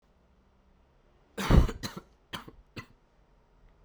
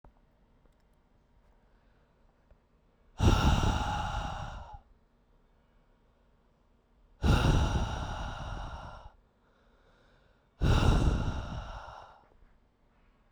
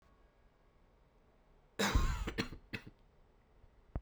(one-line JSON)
{"three_cough_length": "3.8 s", "three_cough_amplitude": 15573, "three_cough_signal_mean_std_ratio": 0.25, "exhalation_length": "13.3 s", "exhalation_amplitude": 9368, "exhalation_signal_mean_std_ratio": 0.42, "cough_length": "4.0 s", "cough_amplitude": 3439, "cough_signal_mean_std_ratio": 0.37, "survey_phase": "beta (2021-08-13 to 2022-03-07)", "age": "18-44", "gender": "Male", "wearing_mask": "No", "symptom_new_continuous_cough": true, "symptom_runny_or_blocked_nose": true, "symptom_sore_throat": true, "symptom_fever_high_temperature": true, "symptom_headache": true, "symptom_onset": "3 days", "smoker_status": "Never smoked", "respiratory_condition_asthma": false, "respiratory_condition_other": false, "recruitment_source": "Test and Trace", "submission_delay": "2 days", "covid_test_result": "Positive", "covid_test_method": "RT-qPCR", "covid_ct_value": 28.1, "covid_ct_gene": "N gene"}